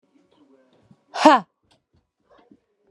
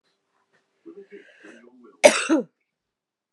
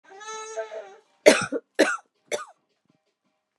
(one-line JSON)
{"exhalation_length": "2.9 s", "exhalation_amplitude": 32215, "exhalation_signal_mean_std_ratio": 0.2, "cough_length": "3.3 s", "cough_amplitude": 32767, "cough_signal_mean_std_ratio": 0.23, "three_cough_length": "3.6 s", "three_cough_amplitude": 32758, "three_cough_signal_mean_std_ratio": 0.3, "survey_phase": "beta (2021-08-13 to 2022-03-07)", "age": "18-44", "gender": "Female", "wearing_mask": "No", "symptom_cough_any": true, "symptom_runny_or_blocked_nose": true, "symptom_sore_throat": true, "symptom_headache": true, "symptom_change_to_sense_of_smell_or_taste": true, "symptom_loss_of_taste": true, "symptom_onset": "4 days", "smoker_status": "Never smoked", "respiratory_condition_asthma": false, "respiratory_condition_other": false, "recruitment_source": "Test and Trace", "submission_delay": "2 days", "covid_test_result": "Positive", "covid_test_method": "RT-qPCR", "covid_ct_value": 36.8, "covid_ct_gene": "ORF1ab gene"}